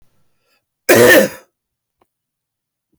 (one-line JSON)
{"cough_length": "3.0 s", "cough_amplitude": 32768, "cough_signal_mean_std_ratio": 0.32, "survey_phase": "beta (2021-08-13 to 2022-03-07)", "age": "45-64", "gender": "Male", "wearing_mask": "No", "symptom_new_continuous_cough": true, "symptom_sore_throat": true, "symptom_fatigue": true, "symptom_loss_of_taste": true, "symptom_onset": "4 days", "smoker_status": "Never smoked", "respiratory_condition_asthma": false, "respiratory_condition_other": false, "recruitment_source": "Test and Trace", "submission_delay": "1 day", "covid_test_result": "Positive", "covid_test_method": "RT-qPCR"}